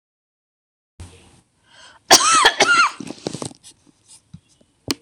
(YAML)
cough_length: 5.0 s
cough_amplitude: 26028
cough_signal_mean_std_ratio: 0.34
survey_phase: beta (2021-08-13 to 2022-03-07)
age: 45-64
gender: Female
wearing_mask: 'No'
symptom_none: true
smoker_status: Never smoked
respiratory_condition_asthma: false
respiratory_condition_other: false
recruitment_source: REACT
submission_delay: 2 days
covid_test_result: Negative
covid_test_method: RT-qPCR